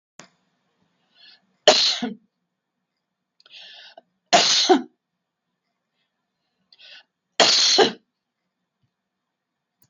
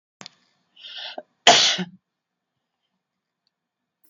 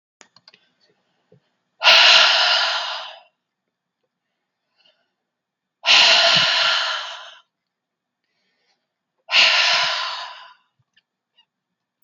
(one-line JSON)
{"three_cough_length": "9.9 s", "three_cough_amplitude": 32767, "three_cough_signal_mean_std_ratio": 0.3, "cough_length": "4.1 s", "cough_amplitude": 32767, "cough_signal_mean_std_ratio": 0.24, "exhalation_length": "12.0 s", "exhalation_amplitude": 32767, "exhalation_signal_mean_std_ratio": 0.41, "survey_phase": "beta (2021-08-13 to 2022-03-07)", "age": "45-64", "gender": "Female", "wearing_mask": "No", "symptom_none": true, "smoker_status": "Never smoked", "respiratory_condition_asthma": true, "respiratory_condition_other": false, "recruitment_source": "REACT", "submission_delay": "1 day", "covid_test_result": "Negative", "covid_test_method": "RT-qPCR", "influenza_a_test_result": "Negative", "influenza_b_test_result": "Negative"}